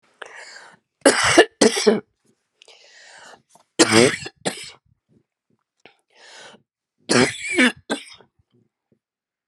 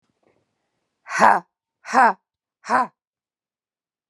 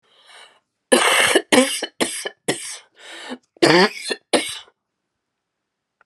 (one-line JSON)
{"three_cough_length": "9.5 s", "three_cough_amplitude": 32474, "three_cough_signal_mean_std_ratio": 0.32, "exhalation_length": "4.1 s", "exhalation_amplitude": 32767, "exhalation_signal_mean_std_ratio": 0.29, "cough_length": "6.1 s", "cough_amplitude": 32767, "cough_signal_mean_std_ratio": 0.41, "survey_phase": "alpha (2021-03-01 to 2021-08-12)", "age": "45-64", "gender": "Female", "wearing_mask": "No", "symptom_cough_any": true, "symptom_diarrhoea": true, "symptom_fatigue": true, "symptom_loss_of_taste": true, "symptom_onset": "4 days", "smoker_status": "Ex-smoker", "respiratory_condition_asthma": false, "respiratory_condition_other": false, "recruitment_source": "Test and Trace", "submission_delay": "2 days", "covid_test_result": "Positive", "covid_test_method": "RT-qPCR", "covid_ct_value": 23.4, "covid_ct_gene": "ORF1ab gene"}